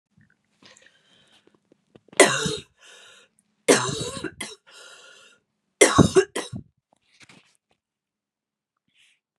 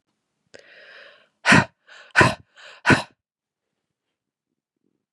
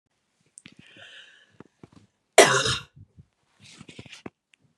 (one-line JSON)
{"three_cough_length": "9.4 s", "three_cough_amplitude": 32767, "three_cough_signal_mean_std_ratio": 0.25, "exhalation_length": "5.1 s", "exhalation_amplitude": 30343, "exhalation_signal_mean_std_ratio": 0.24, "cough_length": "4.8 s", "cough_amplitude": 32682, "cough_signal_mean_std_ratio": 0.21, "survey_phase": "beta (2021-08-13 to 2022-03-07)", "age": "18-44", "gender": "Female", "wearing_mask": "No", "symptom_cough_any": true, "symptom_runny_or_blocked_nose": true, "symptom_onset": "2 days", "smoker_status": "Never smoked", "respiratory_condition_asthma": false, "respiratory_condition_other": false, "recruitment_source": "Test and Trace", "submission_delay": "0 days", "covid_test_result": "Positive", "covid_test_method": "RT-qPCR", "covid_ct_value": 19.6, "covid_ct_gene": "N gene"}